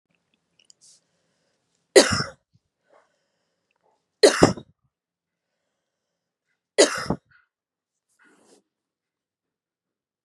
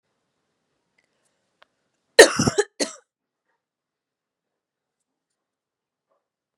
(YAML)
three_cough_length: 10.2 s
three_cough_amplitude: 32768
three_cough_signal_mean_std_ratio: 0.18
cough_length: 6.6 s
cough_amplitude: 32768
cough_signal_mean_std_ratio: 0.15
survey_phase: beta (2021-08-13 to 2022-03-07)
age: 18-44
gender: Female
wearing_mask: 'No'
symptom_cough_any: true
symptom_sore_throat: true
symptom_headache: true
smoker_status: Never smoked
respiratory_condition_asthma: false
respiratory_condition_other: false
recruitment_source: Test and Trace
submission_delay: 1 day
covid_test_result: Positive
covid_test_method: RT-qPCR
covid_ct_value: 19.2
covid_ct_gene: ORF1ab gene
covid_ct_mean: 19.4
covid_viral_load: 430000 copies/ml
covid_viral_load_category: Low viral load (10K-1M copies/ml)